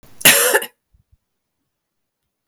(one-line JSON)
{"cough_length": "2.5 s", "cough_amplitude": 32768, "cough_signal_mean_std_ratio": 0.3, "survey_phase": "beta (2021-08-13 to 2022-03-07)", "age": "18-44", "gender": "Female", "wearing_mask": "No", "symptom_cough_any": true, "symptom_runny_or_blocked_nose": true, "symptom_sore_throat": true, "symptom_fatigue": true, "symptom_change_to_sense_of_smell_or_taste": true, "smoker_status": "Never smoked", "respiratory_condition_asthma": false, "respiratory_condition_other": false, "recruitment_source": "Test and Trace", "submission_delay": "2 days", "covid_test_result": "Positive", "covid_test_method": "RT-qPCR"}